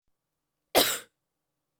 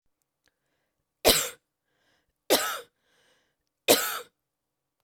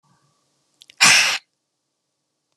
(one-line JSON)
{"cough_length": "1.8 s", "cough_amplitude": 18174, "cough_signal_mean_std_ratio": 0.26, "three_cough_length": "5.0 s", "three_cough_amplitude": 20495, "three_cough_signal_mean_std_ratio": 0.27, "exhalation_length": "2.6 s", "exhalation_amplitude": 32696, "exhalation_signal_mean_std_ratio": 0.29, "survey_phase": "beta (2021-08-13 to 2022-03-07)", "age": "18-44", "gender": "Female", "wearing_mask": "No", "symptom_none": true, "smoker_status": "Prefer not to say", "respiratory_condition_asthma": false, "respiratory_condition_other": false, "recruitment_source": "REACT", "submission_delay": "2 days", "covid_test_result": "Negative", "covid_test_method": "RT-qPCR", "influenza_a_test_result": "Negative", "influenza_b_test_result": "Negative"}